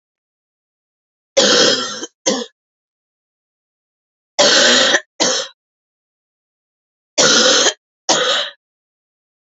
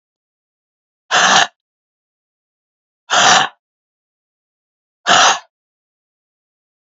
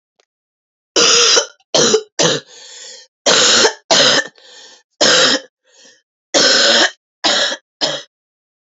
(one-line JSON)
{"three_cough_length": "9.5 s", "three_cough_amplitude": 32768, "three_cough_signal_mean_std_ratio": 0.43, "exhalation_length": "6.9 s", "exhalation_amplitude": 31772, "exhalation_signal_mean_std_ratio": 0.31, "cough_length": "8.7 s", "cough_amplitude": 32768, "cough_signal_mean_std_ratio": 0.54, "survey_phase": "beta (2021-08-13 to 2022-03-07)", "age": "18-44", "gender": "Female", "wearing_mask": "No", "symptom_cough_any": true, "symptom_runny_or_blocked_nose": true, "symptom_fatigue": true, "symptom_fever_high_temperature": true, "symptom_headache": true, "symptom_other": true, "symptom_onset": "4 days", "smoker_status": "Ex-smoker", "respiratory_condition_asthma": false, "respiratory_condition_other": false, "recruitment_source": "Test and Trace", "submission_delay": "2 days", "covid_test_result": "Positive", "covid_test_method": "RT-qPCR"}